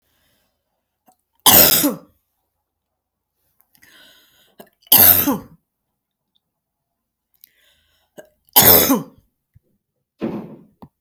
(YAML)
three_cough_length: 11.0 s
three_cough_amplitude: 32768
three_cough_signal_mean_std_ratio: 0.28
survey_phase: beta (2021-08-13 to 2022-03-07)
age: 65+
gender: Female
wearing_mask: 'No'
symptom_none: true
smoker_status: Never smoked
respiratory_condition_asthma: false
respiratory_condition_other: false
recruitment_source: REACT
submission_delay: 1 day
covid_test_result: Negative
covid_test_method: RT-qPCR